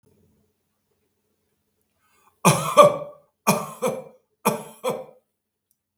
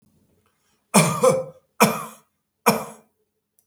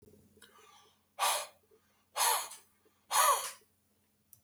three_cough_length: 6.0 s
three_cough_amplitude: 32768
three_cough_signal_mean_std_ratio: 0.29
cough_length: 3.7 s
cough_amplitude: 32766
cough_signal_mean_std_ratio: 0.36
exhalation_length: 4.4 s
exhalation_amplitude: 7326
exhalation_signal_mean_std_ratio: 0.37
survey_phase: beta (2021-08-13 to 2022-03-07)
age: 65+
gender: Male
wearing_mask: 'No'
symptom_none: true
smoker_status: Never smoked
respiratory_condition_asthma: false
respiratory_condition_other: false
recruitment_source: REACT
submission_delay: 2 days
covid_test_result: Negative
covid_test_method: RT-qPCR
influenza_a_test_result: Negative
influenza_b_test_result: Negative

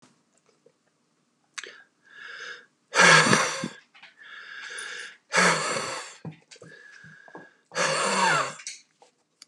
exhalation_length: 9.5 s
exhalation_amplitude: 21721
exhalation_signal_mean_std_ratio: 0.4
survey_phase: beta (2021-08-13 to 2022-03-07)
age: 45-64
gender: Male
wearing_mask: 'No'
symptom_none: true
smoker_status: Current smoker (11 or more cigarettes per day)
respiratory_condition_asthma: false
respiratory_condition_other: false
recruitment_source: REACT
submission_delay: 1 day
covid_test_result: Negative
covid_test_method: RT-qPCR
influenza_a_test_result: Negative
influenza_b_test_result: Negative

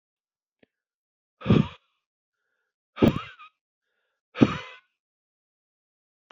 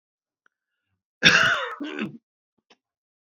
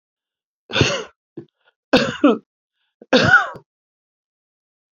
exhalation_length: 6.3 s
exhalation_amplitude: 26144
exhalation_signal_mean_std_ratio: 0.21
cough_length: 3.2 s
cough_amplitude: 32767
cough_signal_mean_std_ratio: 0.32
three_cough_length: 4.9 s
three_cough_amplitude: 30286
three_cough_signal_mean_std_ratio: 0.34
survey_phase: beta (2021-08-13 to 2022-03-07)
age: 45-64
gender: Male
wearing_mask: 'No'
symptom_none: true
smoker_status: Never smoked
respiratory_condition_asthma: false
respiratory_condition_other: false
recruitment_source: REACT
submission_delay: 5 days
covid_test_result: Negative
covid_test_method: RT-qPCR
influenza_a_test_result: Negative
influenza_b_test_result: Negative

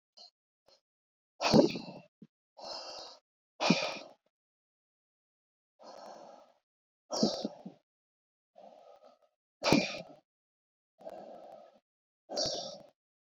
exhalation_length: 13.2 s
exhalation_amplitude: 10394
exhalation_signal_mean_std_ratio: 0.29
survey_phase: beta (2021-08-13 to 2022-03-07)
age: 65+
gender: Male
wearing_mask: 'No'
symptom_cough_any: true
symptom_onset: 12 days
smoker_status: Ex-smoker
respiratory_condition_asthma: false
respiratory_condition_other: false
recruitment_source: REACT
submission_delay: 1 day
covid_test_result: Negative
covid_test_method: RT-qPCR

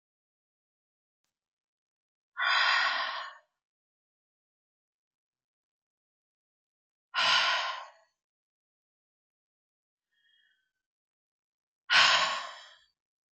exhalation_length: 13.3 s
exhalation_amplitude: 12949
exhalation_signal_mean_std_ratio: 0.3
survey_phase: beta (2021-08-13 to 2022-03-07)
age: 65+
gender: Female
wearing_mask: 'No'
symptom_none: true
smoker_status: Ex-smoker
respiratory_condition_asthma: false
respiratory_condition_other: false
recruitment_source: REACT
submission_delay: 15 days
covid_test_result: Negative
covid_test_method: RT-qPCR
influenza_a_test_result: Negative
influenza_b_test_result: Negative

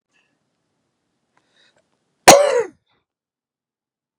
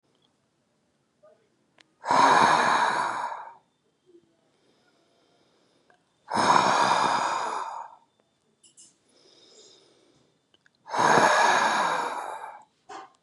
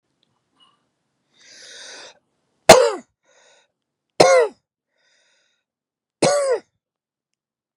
cough_length: 4.2 s
cough_amplitude: 32768
cough_signal_mean_std_ratio: 0.21
exhalation_length: 13.2 s
exhalation_amplitude: 20114
exhalation_signal_mean_std_ratio: 0.46
three_cough_length: 7.8 s
three_cough_amplitude: 32768
three_cough_signal_mean_std_ratio: 0.25
survey_phase: beta (2021-08-13 to 2022-03-07)
age: 45-64
gender: Male
wearing_mask: 'No'
symptom_cough_any: true
symptom_runny_or_blocked_nose: true
symptom_sore_throat: true
symptom_fatigue: true
symptom_headache: true
symptom_loss_of_taste: true
symptom_onset: 3 days
smoker_status: Ex-smoker
respiratory_condition_asthma: false
respiratory_condition_other: false
recruitment_source: Test and Trace
submission_delay: 1 day
covid_test_result: Positive
covid_test_method: RT-qPCR
covid_ct_value: 20.5
covid_ct_gene: N gene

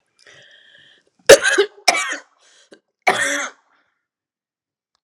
cough_length: 5.0 s
cough_amplitude: 32768
cough_signal_mean_std_ratio: 0.28
survey_phase: alpha (2021-03-01 to 2021-08-12)
age: 45-64
gender: Female
wearing_mask: 'No'
symptom_cough_any: true
symptom_fatigue: true
symptom_fever_high_temperature: true
symptom_headache: true
symptom_change_to_sense_of_smell_or_taste: true
symptom_onset: 3 days
smoker_status: Never smoked
respiratory_condition_asthma: false
respiratory_condition_other: false
recruitment_source: Test and Trace
submission_delay: 2 days
covid_test_result: Positive
covid_test_method: RT-qPCR
covid_ct_value: 21.0
covid_ct_gene: ORF1ab gene
covid_ct_mean: 21.6
covid_viral_load: 81000 copies/ml
covid_viral_load_category: Low viral load (10K-1M copies/ml)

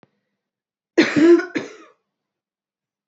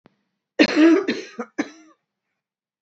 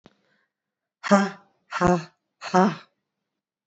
cough_length: 3.1 s
cough_amplitude: 23589
cough_signal_mean_std_ratio: 0.32
three_cough_length: 2.8 s
three_cough_amplitude: 25639
three_cough_signal_mean_std_ratio: 0.37
exhalation_length: 3.7 s
exhalation_amplitude: 22262
exhalation_signal_mean_std_ratio: 0.34
survey_phase: beta (2021-08-13 to 2022-03-07)
age: 18-44
gender: Female
wearing_mask: 'No'
symptom_cough_any: true
symptom_change_to_sense_of_smell_or_taste: true
smoker_status: Ex-smoker
respiratory_condition_asthma: false
respiratory_condition_other: false
recruitment_source: REACT
submission_delay: 1 day
covid_test_result: Negative
covid_test_method: RT-qPCR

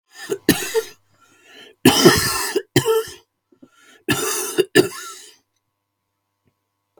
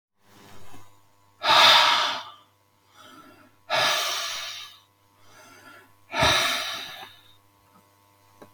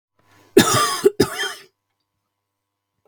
three_cough_length: 7.0 s
three_cough_amplitude: 32768
three_cough_signal_mean_std_ratio: 0.39
exhalation_length: 8.5 s
exhalation_amplitude: 21647
exhalation_signal_mean_std_ratio: 0.41
cough_length: 3.1 s
cough_amplitude: 32768
cough_signal_mean_std_ratio: 0.34
survey_phase: beta (2021-08-13 to 2022-03-07)
age: 65+
gender: Male
wearing_mask: 'No'
symptom_none: true
smoker_status: Never smoked
respiratory_condition_asthma: false
respiratory_condition_other: false
recruitment_source: REACT
submission_delay: 2 days
covid_test_result: Negative
covid_test_method: RT-qPCR
influenza_a_test_result: Negative
influenza_b_test_result: Negative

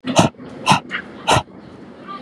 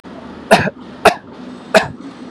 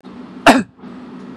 exhalation_length: 2.2 s
exhalation_amplitude: 32768
exhalation_signal_mean_std_ratio: 0.47
three_cough_length: 2.3 s
three_cough_amplitude: 32768
three_cough_signal_mean_std_ratio: 0.4
cough_length: 1.4 s
cough_amplitude: 32768
cough_signal_mean_std_ratio: 0.36
survey_phase: beta (2021-08-13 to 2022-03-07)
age: 45-64
gender: Male
wearing_mask: 'No'
symptom_none: true
smoker_status: Never smoked
respiratory_condition_asthma: false
respiratory_condition_other: false
recruitment_source: REACT
submission_delay: 2 days
covid_test_result: Negative
covid_test_method: RT-qPCR
influenza_a_test_result: Negative
influenza_b_test_result: Negative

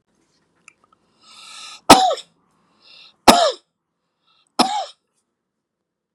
three_cough_length: 6.1 s
three_cough_amplitude: 32768
three_cough_signal_mean_std_ratio: 0.25
survey_phase: beta (2021-08-13 to 2022-03-07)
age: 65+
gender: Male
wearing_mask: 'No'
symptom_none: true
smoker_status: Never smoked
respiratory_condition_asthma: false
respiratory_condition_other: false
recruitment_source: Test and Trace
submission_delay: 2 days
covid_test_result: Positive
covid_test_method: LFT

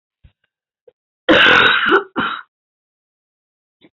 cough_length: 3.9 s
cough_amplitude: 29023
cough_signal_mean_std_ratio: 0.39
survey_phase: beta (2021-08-13 to 2022-03-07)
age: 65+
gender: Female
wearing_mask: 'No'
symptom_cough_any: true
symptom_fatigue: true
symptom_headache: true
symptom_onset: 11 days
smoker_status: Ex-smoker
respiratory_condition_asthma: false
respiratory_condition_other: false
recruitment_source: REACT
submission_delay: 1 day
covid_test_result: Negative
covid_test_method: RT-qPCR
influenza_a_test_result: Negative
influenza_b_test_result: Negative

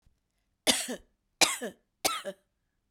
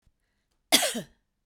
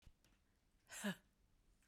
three_cough_length: 2.9 s
three_cough_amplitude: 21398
three_cough_signal_mean_std_ratio: 0.32
cough_length: 1.5 s
cough_amplitude: 21188
cough_signal_mean_std_ratio: 0.3
exhalation_length: 1.9 s
exhalation_amplitude: 754
exhalation_signal_mean_std_ratio: 0.31
survey_phase: beta (2021-08-13 to 2022-03-07)
age: 45-64
gender: Female
wearing_mask: 'No'
symptom_none: true
smoker_status: Never smoked
respiratory_condition_asthma: false
respiratory_condition_other: false
recruitment_source: REACT
submission_delay: 6 days
covid_test_result: Negative
covid_test_method: RT-qPCR
influenza_a_test_result: Negative
influenza_b_test_result: Negative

